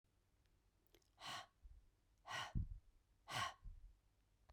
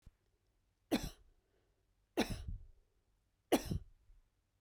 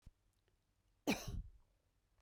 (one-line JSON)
{"exhalation_length": "4.5 s", "exhalation_amplitude": 1047, "exhalation_signal_mean_std_ratio": 0.42, "three_cough_length": "4.6 s", "three_cough_amplitude": 4290, "three_cough_signal_mean_std_ratio": 0.29, "cough_length": "2.2 s", "cough_amplitude": 2340, "cough_signal_mean_std_ratio": 0.3, "survey_phase": "beta (2021-08-13 to 2022-03-07)", "age": "45-64", "gender": "Female", "wearing_mask": "No", "symptom_cough_any": true, "symptom_shortness_of_breath": true, "symptom_sore_throat": true, "symptom_onset": "12 days", "smoker_status": "Never smoked", "respiratory_condition_asthma": false, "respiratory_condition_other": false, "recruitment_source": "REACT", "submission_delay": "1 day", "covid_test_result": "Negative", "covid_test_method": "RT-qPCR", "influenza_a_test_result": "Negative", "influenza_b_test_result": "Negative"}